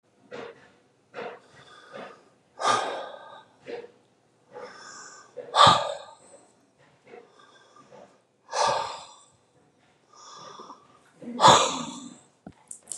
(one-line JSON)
{"exhalation_length": "13.0 s", "exhalation_amplitude": 27573, "exhalation_signal_mean_std_ratio": 0.3, "survey_phase": "beta (2021-08-13 to 2022-03-07)", "age": "45-64", "gender": "Male", "wearing_mask": "No", "symptom_cough_any": true, "symptom_runny_or_blocked_nose": true, "symptom_shortness_of_breath": true, "symptom_sore_throat": true, "symptom_abdominal_pain": true, "symptom_fatigue": true, "symptom_onset": "5 days", "smoker_status": "Never smoked", "respiratory_condition_asthma": false, "respiratory_condition_other": false, "recruitment_source": "REACT", "submission_delay": "5 days", "covid_test_result": "Positive", "covid_test_method": "RT-qPCR", "covid_ct_value": 27.6, "covid_ct_gene": "E gene", "influenza_a_test_result": "Negative", "influenza_b_test_result": "Negative"}